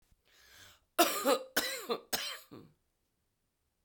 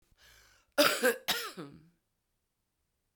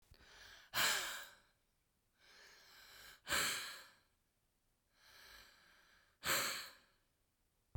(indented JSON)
{
  "three_cough_length": "3.8 s",
  "three_cough_amplitude": 9379,
  "three_cough_signal_mean_std_ratio": 0.37,
  "cough_length": "3.2 s",
  "cough_amplitude": 9754,
  "cough_signal_mean_std_ratio": 0.32,
  "exhalation_length": "7.8 s",
  "exhalation_amplitude": 2188,
  "exhalation_signal_mean_std_ratio": 0.38,
  "survey_phase": "beta (2021-08-13 to 2022-03-07)",
  "age": "45-64",
  "gender": "Female",
  "wearing_mask": "No",
  "symptom_cough_any": true,
  "symptom_runny_or_blocked_nose": true,
  "symptom_sore_throat": true,
  "symptom_headache": true,
  "symptom_onset": "4 days",
  "smoker_status": "Never smoked",
  "recruitment_source": "Test and Trace",
  "submission_delay": "1 day",
  "covid_test_result": "Positive",
  "covid_test_method": "ePCR"
}